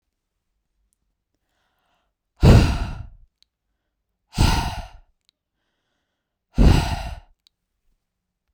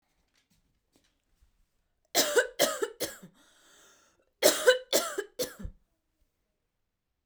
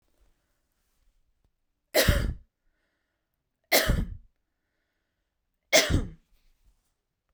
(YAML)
exhalation_length: 8.5 s
exhalation_amplitude: 32768
exhalation_signal_mean_std_ratio: 0.28
cough_length: 7.3 s
cough_amplitude: 15520
cough_signal_mean_std_ratio: 0.31
three_cough_length: 7.3 s
three_cough_amplitude: 17660
three_cough_signal_mean_std_ratio: 0.29
survey_phase: beta (2021-08-13 to 2022-03-07)
age: 18-44
gender: Female
wearing_mask: 'No'
symptom_fatigue: true
symptom_onset: 12 days
smoker_status: Ex-smoker
respiratory_condition_asthma: false
respiratory_condition_other: false
recruitment_source: REACT
submission_delay: 1 day
covid_test_result: Negative
covid_test_method: RT-qPCR